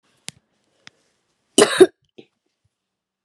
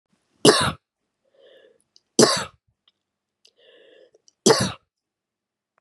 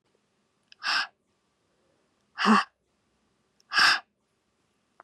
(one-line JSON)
{"cough_length": "3.2 s", "cough_amplitude": 32768, "cough_signal_mean_std_ratio": 0.19, "three_cough_length": "5.8 s", "three_cough_amplitude": 31737, "three_cough_signal_mean_std_ratio": 0.26, "exhalation_length": "5.0 s", "exhalation_amplitude": 14870, "exhalation_signal_mean_std_ratio": 0.29, "survey_phase": "beta (2021-08-13 to 2022-03-07)", "age": "45-64", "gender": "Female", "wearing_mask": "No", "symptom_cough_any": true, "symptom_runny_or_blocked_nose": true, "symptom_sore_throat": true, "symptom_fatigue": true, "symptom_headache": true, "symptom_onset": "4 days", "smoker_status": "Never smoked", "respiratory_condition_asthma": false, "respiratory_condition_other": false, "recruitment_source": "Test and Trace", "submission_delay": "2 days", "covid_test_result": "Positive", "covid_test_method": "RT-qPCR", "covid_ct_value": 30.0, "covid_ct_gene": "ORF1ab gene"}